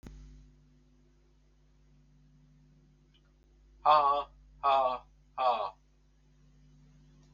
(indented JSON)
{
  "exhalation_length": "7.3 s",
  "exhalation_amplitude": 8612,
  "exhalation_signal_mean_std_ratio": 0.32,
  "survey_phase": "beta (2021-08-13 to 2022-03-07)",
  "age": "65+",
  "gender": "Male",
  "wearing_mask": "No",
  "symptom_runny_or_blocked_nose": true,
  "smoker_status": "Ex-smoker",
  "respiratory_condition_asthma": false,
  "respiratory_condition_other": false,
  "recruitment_source": "REACT",
  "submission_delay": "7 days",
  "covid_test_result": "Negative",
  "covid_test_method": "RT-qPCR"
}